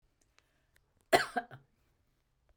{"cough_length": "2.6 s", "cough_amplitude": 10480, "cough_signal_mean_std_ratio": 0.19, "survey_phase": "beta (2021-08-13 to 2022-03-07)", "age": "45-64", "gender": "Female", "wearing_mask": "No", "symptom_none": true, "smoker_status": "Ex-smoker", "respiratory_condition_asthma": false, "respiratory_condition_other": false, "recruitment_source": "REACT", "submission_delay": "2 days", "covid_test_result": "Negative", "covid_test_method": "RT-qPCR"}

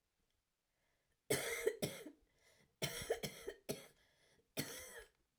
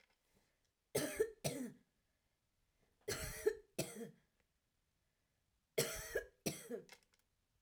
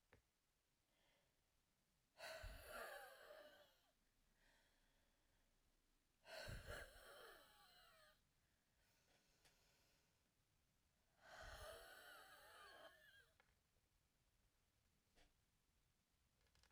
{"cough_length": "5.4 s", "cough_amplitude": 2388, "cough_signal_mean_std_ratio": 0.41, "three_cough_length": "7.6 s", "three_cough_amplitude": 2504, "three_cough_signal_mean_std_ratio": 0.36, "exhalation_length": "16.7 s", "exhalation_amplitude": 264, "exhalation_signal_mean_std_ratio": 0.49, "survey_phase": "alpha (2021-03-01 to 2021-08-12)", "age": "45-64", "gender": "Female", "wearing_mask": "No", "symptom_diarrhoea": true, "symptom_onset": "12 days", "smoker_status": "Current smoker (1 to 10 cigarettes per day)", "respiratory_condition_asthma": false, "respiratory_condition_other": false, "recruitment_source": "REACT", "submission_delay": "14 days", "covid_test_result": "Negative", "covid_test_method": "RT-qPCR"}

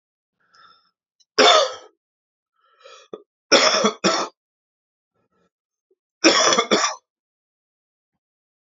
{"three_cough_length": "8.7 s", "three_cough_amplitude": 31826, "three_cough_signal_mean_std_ratio": 0.33, "survey_phase": "alpha (2021-03-01 to 2021-08-12)", "age": "45-64", "gender": "Male", "wearing_mask": "No", "symptom_fatigue": true, "symptom_headache": true, "symptom_change_to_sense_of_smell_or_taste": true, "smoker_status": "Ex-smoker", "respiratory_condition_asthma": false, "respiratory_condition_other": false, "recruitment_source": "Test and Trace", "submission_delay": "2 days", "covid_test_result": "Positive", "covid_test_method": "RT-qPCR", "covid_ct_value": 16.1, "covid_ct_gene": "ORF1ab gene", "covid_ct_mean": 16.5, "covid_viral_load": "3700000 copies/ml", "covid_viral_load_category": "High viral load (>1M copies/ml)"}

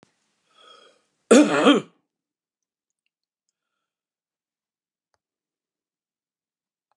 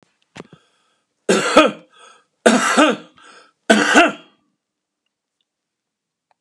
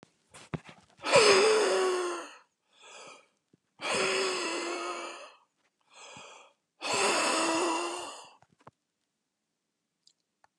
{"cough_length": "7.0 s", "cough_amplitude": 27267, "cough_signal_mean_std_ratio": 0.2, "three_cough_length": "6.4 s", "three_cough_amplitude": 32768, "three_cough_signal_mean_std_ratio": 0.35, "exhalation_length": "10.6 s", "exhalation_amplitude": 12975, "exhalation_signal_mean_std_ratio": 0.48, "survey_phase": "beta (2021-08-13 to 2022-03-07)", "age": "65+", "gender": "Male", "wearing_mask": "No", "symptom_none": true, "smoker_status": "Never smoked", "respiratory_condition_asthma": true, "respiratory_condition_other": false, "recruitment_source": "REACT", "submission_delay": "2 days", "covid_test_result": "Negative", "covid_test_method": "RT-qPCR", "influenza_a_test_result": "Negative", "influenza_b_test_result": "Negative"}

